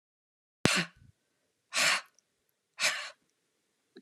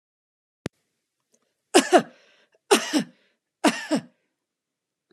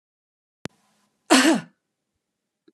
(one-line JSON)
{"exhalation_length": "4.0 s", "exhalation_amplitude": 22616, "exhalation_signal_mean_std_ratio": 0.32, "three_cough_length": "5.1 s", "three_cough_amplitude": 28319, "three_cough_signal_mean_std_ratio": 0.27, "cough_length": "2.7 s", "cough_amplitude": 31137, "cough_signal_mean_std_ratio": 0.26, "survey_phase": "beta (2021-08-13 to 2022-03-07)", "age": "45-64", "gender": "Female", "wearing_mask": "No", "symptom_none": true, "smoker_status": "Never smoked", "respiratory_condition_asthma": false, "respiratory_condition_other": false, "recruitment_source": "REACT", "submission_delay": "2 days", "covid_test_result": "Negative", "covid_test_method": "RT-qPCR"}